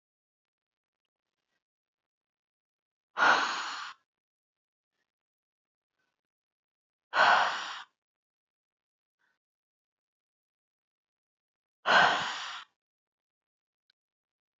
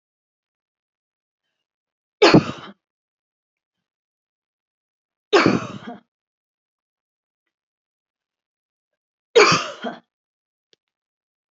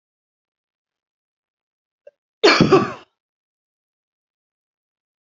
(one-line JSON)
{"exhalation_length": "14.6 s", "exhalation_amplitude": 11122, "exhalation_signal_mean_std_ratio": 0.25, "three_cough_length": "11.5 s", "three_cough_amplitude": 31041, "three_cough_signal_mean_std_ratio": 0.21, "cough_length": "5.2 s", "cough_amplitude": 28062, "cough_signal_mean_std_ratio": 0.22, "survey_phase": "beta (2021-08-13 to 2022-03-07)", "age": "45-64", "gender": "Female", "wearing_mask": "No", "symptom_none": true, "smoker_status": "Never smoked", "respiratory_condition_asthma": false, "respiratory_condition_other": false, "recruitment_source": "Test and Trace", "submission_delay": "2 days", "covid_test_result": "Positive", "covid_test_method": "RT-qPCR", "covid_ct_value": 33.5, "covid_ct_gene": "N gene"}